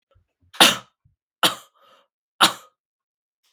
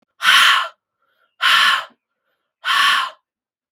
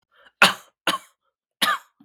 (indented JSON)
{
  "three_cough_length": "3.5 s",
  "three_cough_amplitude": 32768,
  "three_cough_signal_mean_std_ratio": 0.23,
  "exhalation_length": "3.7 s",
  "exhalation_amplitude": 32743,
  "exhalation_signal_mean_std_ratio": 0.5,
  "cough_length": "2.0 s",
  "cough_amplitude": 32767,
  "cough_signal_mean_std_ratio": 0.3,
  "survey_phase": "beta (2021-08-13 to 2022-03-07)",
  "age": "18-44",
  "gender": "Male",
  "wearing_mask": "Yes",
  "symptom_runny_or_blocked_nose": true,
  "symptom_sore_throat": true,
  "symptom_diarrhoea": true,
  "symptom_fatigue": true,
  "symptom_fever_high_temperature": true,
  "symptom_change_to_sense_of_smell_or_taste": true,
  "symptom_loss_of_taste": true,
  "symptom_onset": "3 days",
  "smoker_status": "Never smoked",
  "respiratory_condition_asthma": false,
  "respiratory_condition_other": false,
  "recruitment_source": "Test and Trace",
  "submission_delay": "1 day",
  "covid_test_result": "Positive",
  "covid_test_method": "RT-qPCR",
  "covid_ct_value": 14.9,
  "covid_ct_gene": "ORF1ab gene",
  "covid_ct_mean": 15.3,
  "covid_viral_load": "9900000 copies/ml",
  "covid_viral_load_category": "High viral load (>1M copies/ml)"
}